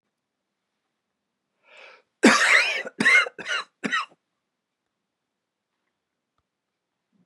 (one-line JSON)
{"cough_length": "7.3 s", "cough_amplitude": 24362, "cough_signal_mean_std_ratio": 0.3, "survey_phase": "beta (2021-08-13 to 2022-03-07)", "age": "45-64", "gender": "Male", "wearing_mask": "No", "symptom_none": true, "smoker_status": "Never smoked", "respiratory_condition_asthma": false, "respiratory_condition_other": false, "recruitment_source": "REACT", "submission_delay": "2 days", "covid_test_result": "Negative", "covid_test_method": "RT-qPCR", "influenza_a_test_result": "Unknown/Void", "influenza_b_test_result": "Unknown/Void"}